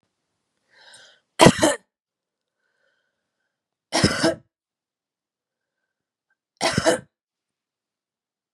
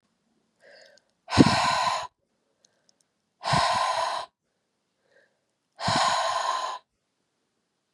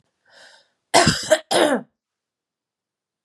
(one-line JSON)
{"three_cough_length": "8.5 s", "three_cough_amplitude": 32767, "three_cough_signal_mean_std_ratio": 0.23, "exhalation_length": "7.9 s", "exhalation_amplitude": 28198, "exhalation_signal_mean_std_ratio": 0.43, "cough_length": "3.2 s", "cough_amplitude": 31561, "cough_signal_mean_std_ratio": 0.35, "survey_phase": "beta (2021-08-13 to 2022-03-07)", "age": "18-44", "gender": "Female", "wearing_mask": "No", "symptom_cough_any": true, "symptom_sore_throat": true, "symptom_fatigue": true, "symptom_headache": true, "symptom_change_to_sense_of_smell_or_taste": true, "symptom_onset": "6 days", "smoker_status": "Ex-smoker", "respiratory_condition_asthma": false, "respiratory_condition_other": false, "recruitment_source": "REACT", "submission_delay": "2 days", "covid_test_result": "Positive", "covid_test_method": "RT-qPCR", "covid_ct_value": 21.5, "covid_ct_gene": "E gene", "influenza_a_test_result": "Negative", "influenza_b_test_result": "Negative"}